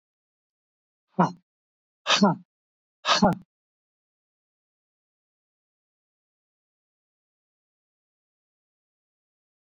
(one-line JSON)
{"exhalation_length": "9.6 s", "exhalation_amplitude": 14629, "exhalation_signal_mean_std_ratio": 0.2, "survey_phase": "beta (2021-08-13 to 2022-03-07)", "age": "45-64", "gender": "Male", "wearing_mask": "No", "symptom_none": true, "smoker_status": "Never smoked", "respiratory_condition_asthma": false, "respiratory_condition_other": false, "recruitment_source": "REACT", "submission_delay": "6 days", "covid_test_result": "Negative", "covid_test_method": "RT-qPCR", "influenza_a_test_result": "Negative", "influenza_b_test_result": "Negative"}